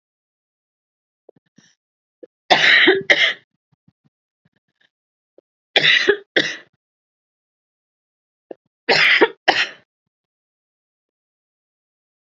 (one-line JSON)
{"three_cough_length": "12.4 s", "three_cough_amplitude": 30408, "three_cough_signal_mean_std_ratio": 0.3, "survey_phase": "beta (2021-08-13 to 2022-03-07)", "age": "18-44", "gender": "Female", "wearing_mask": "No", "symptom_cough_any": true, "smoker_status": "Never smoked", "respiratory_condition_asthma": false, "respiratory_condition_other": false, "recruitment_source": "REACT", "submission_delay": "1 day", "covid_test_result": "Negative", "covid_test_method": "RT-qPCR", "influenza_a_test_result": "Negative", "influenza_b_test_result": "Negative"}